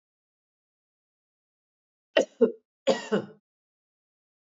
{"cough_length": "4.4 s", "cough_amplitude": 13874, "cough_signal_mean_std_ratio": 0.22, "survey_phase": "alpha (2021-03-01 to 2021-08-12)", "age": "45-64", "gender": "Female", "wearing_mask": "No", "symptom_none": true, "smoker_status": "Ex-smoker", "respiratory_condition_asthma": false, "respiratory_condition_other": false, "recruitment_source": "REACT", "submission_delay": "10 days", "covid_test_result": "Negative", "covid_test_method": "RT-qPCR"}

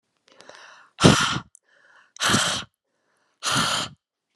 {"exhalation_length": "4.4 s", "exhalation_amplitude": 32768, "exhalation_signal_mean_std_ratio": 0.39, "survey_phase": "beta (2021-08-13 to 2022-03-07)", "age": "18-44", "gender": "Female", "wearing_mask": "No", "symptom_runny_or_blocked_nose": true, "smoker_status": "Never smoked", "respiratory_condition_asthma": false, "respiratory_condition_other": false, "recruitment_source": "REACT", "submission_delay": "5 days", "covid_test_result": "Negative", "covid_test_method": "RT-qPCR"}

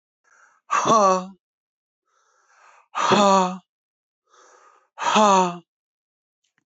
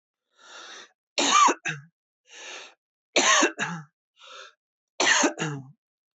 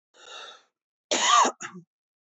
{"exhalation_length": "6.7 s", "exhalation_amplitude": 21329, "exhalation_signal_mean_std_ratio": 0.39, "three_cough_length": "6.1 s", "three_cough_amplitude": 15757, "three_cough_signal_mean_std_ratio": 0.41, "cough_length": "2.2 s", "cough_amplitude": 12545, "cough_signal_mean_std_ratio": 0.38, "survey_phase": "beta (2021-08-13 to 2022-03-07)", "age": "45-64", "gender": "Male", "wearing_mask": "No", "symptom_none": true, "smoker_status": "Ex-smoker", "respiratory_condition_asthma": false, "respiratory_condition_other": false, "recruitment_source": "Test and Trace", "submission_delay": "2 days", "covid_test_result": "Negative", "covid_test_method": "RT-qPCR"}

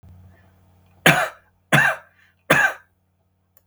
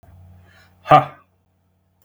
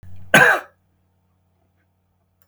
{"three_cough_length": "3.7 s", "three_cough_amplitude": 32768, "three_cough_signal_mean_std_ratio": 0.34, "exhalation_length": "2.0 s", "exhalation_amplitude": 32767, "exhalation_signal_mean_std_ratio": 0.22, "cough_length": "2.5 s", "cough_amplitude": 32768, "cough_signal_mean_std_ratio": 0.28, "survey_phase": "beta (2021-08-13 to 2022-03-07)", "age": "45-64", "gender": "Male", "wearing_mask": "No", "symptom_none": true, "smoker_status": "Ex-smoker", "respiratory_condition_asthma": false, "respiratory_condition_other": false, "recruitment_source": "REACT", "submission_delay": "15 days", "covid_test_result": "Negative", "covid_test_method": "RT-qPCR"}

